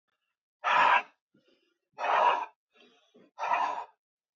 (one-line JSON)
{"exhalation_length": "4.4 s", "exhalation_amplitude": 7964, "exhalation_signal_mean_std_ratio": 0.43, "survey_phase": "alpha (2021-03-01 to 2021-08-12)", "age": "18-44", "gender": "Male", "wearing_mask": "No", "symptom_cough_any": true, "symptom_headache": true, "symptom_onset": "3 days", "smoker_status": "Never smoked", "respiratory_condition_asthma": false, "respiratory_condition_other": false, "recruitment_source": "Test and Trace", "submission_delay": "0 days", "covid_test_result": "Positive", "covid_test_method": "RT-qPCR"}